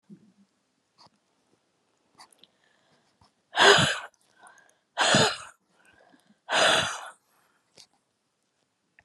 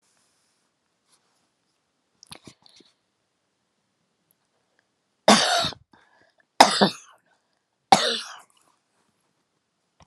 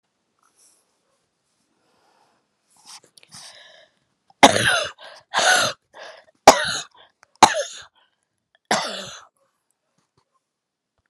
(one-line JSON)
{"exhalation_length": "9.0 s", "exhalation_amplitude": 20964, "exhalation_signal_mean_std_ratio": 0.29, "three_cough_length": "10.1 s", "three_cough_amplitude": 32768, "three_cough_signal_mean_std_ratio": 0.21, "cough_length": "11.1 s", "cough_amplitude": 32768, "cough_signal_mean_std_ratio": 0.24, "survey_phase": "alpha (2021-03-01 to 2021-08-12)", "age": "65+", "gender": "Female", "wearing_mask": "No", "symptom_none": true, "smoker_status": "Ex-smoker", "respiratory_condition_asthma": false, "respiratory_condition_other": false, "recruitment_source": "REACT", "submission_delay": "1 day", "covid_test_result": "Negative", "covid_test_method": "RT-qPCR"}